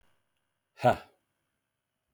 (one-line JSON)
{"exhalation_length": "2.1 s", "exhalation_amplitude": 9417, "exhalation_signal_mean_std_ratio": 0.19, "survey_phase": "beta (2021-08-13 to 2022-03-07)", "age": "45-64", "gender": "Male", "wearing_mask": "No", "symptom_cough_any": true, "symptom_fatigue": true, "symptom_change_to_sense_of_smell_or_taste": true, "symptom_loss_of_taste": true, "smoker_status": "Ex-smoker", "respiratory_condition_asthma": false, "respiratory_condition_other": false, "recruitment_source": "REACT", "submission_delay": "2 days", "covid_test_result": "Negative", "covid_test_method": "RT-qPCR"}